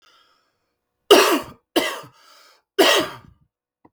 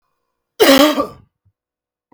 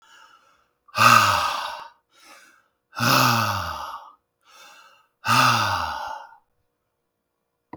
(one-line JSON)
{"three_cough_length": "3.9 s", "three_cough_amplitude": 32768, "three_cough_signal_mean_std_ratio": 0.34, "cough_length": "2.1 s", "cough_amplitude": 32768, "cough_signal_mean_std_ratio": 0.36, "exhalation_length": "7.8 s", "exhalation_amplitude": 30224, "exhalation_signal_mean_std_ratio": 0.44, "survey_phase": "beta (2021-08-13 to 2022-03-07)", "age": "18-44", "gender": "Male", "wearing_mask": "No", "symptom_none": true, "smoker_status": "Ex-smoker", "respiratory_condition_asthma": false, "respiratory_condition_other": false, "recruitment_source": "REACT", "submission_delay": "1 day", "covid_test_result": "Negative", "covid_test_method": "RT-qPCR", "influenza_a_test_result": "Negative", "influenza_b_test_result": "Negative"}